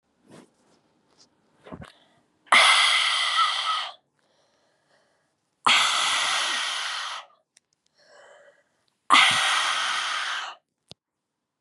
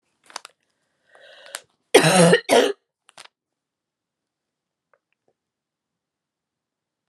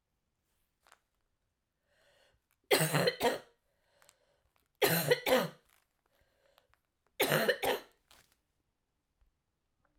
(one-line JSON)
{"exhalation_length": "11.6 s", "exhalation_amplitude": 23212, "exhalation_signal_mean_std_ratio": 0.47, "cough_length": "7.1 s", "cough_amplitude": 32638, "cough_signal_mean_std_ratio": 0.24, "three_cough_length": "10.0 s", "three_cough_amplitude": 6850, "three_cough_signal_mean_std_ratio": 0.32, "survey_phase": "alpha (2021-03-01 to 2021-08-12)", "age": "45-64", "gender": "Female", "wearing_mask": "No", "symptom_cough_any": true, "symptom_diarrhoea": true, "symptom_fatigue": true, "symptom_fever_high_temperature": true, "symptom_headache": true, "smoker_status": "Never smoked", "respiratory_condition_asthma": false, "respiratory_condition_other": false, "recruitment_source": "Test and Trace", "submission_delay": "2 days", "covid_test_result": "Positive", "covid_test_method": "RT-qPCR", "covid_ct_value": 12.7, "covid_ct_gene": "ORF1ab gene", "covid_ct_mean": 13.3, "covid_viral_load": "42000000 copies/ml", "covid_viral_load_category": "High viral load (>1M copies/ml)"}